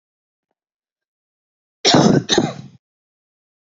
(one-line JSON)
{"cough_length": "3.8 s", "cough_amplitude": 28422, "cough_signal_mean_std_ratio": 0.31, "survey_phase": "beta (2021-08-13 to 2022-03-07)", "age": "18-44", "gender": "Male", "wearing_mask": "No", "symptom_cough_any": true, "symptom_sore_throat": true, "symptom_headache": true, "symptom_onset": "8 days", "smoker_status": "Never smoked", "respiratory_condition_asthma": false, "respiratory_condition_other": false, "recruitment_source": "REACT", "submission_delay": "16 days", "covid_test_result": "Negative", "covid_test_method": "RT-qPCR", "influenza_a_test_result": "Negative", "influenza_b_test_result": "Negative"}